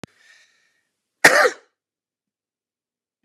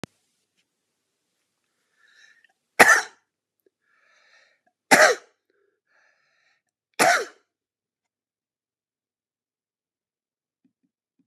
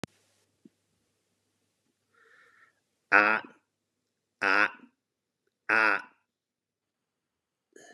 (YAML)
cough_length: 3.2 s
cough_amplitude: 32768
cough_signal_mean_std_ratio: 0.21
three_cough_length: 11.3 s
three_cough_amplitude: 32768
three_cough_signal_mean_std_ratio: 0.19
exhalation_length: 7.9 s
exhalation_amplitude: 18954
exhalation_signal_mean_std_ratio: 0.22
survey_phase: beta (2021-08-13 to 2022-03-07)
age: 45-64
gender: Male
wearing_mask: 'No'
symptom_none: true
smoker_status: Ex-smoker
respiratory_condition_asthma: false
respiratory_condition_other: false
recruitment_source: REACT
submission_delay: 1 day
covid_test_result: Negative
covid_test_method: RT-qPCR
influenza_a_test_result: Negative
influenza_b_test_result: Negative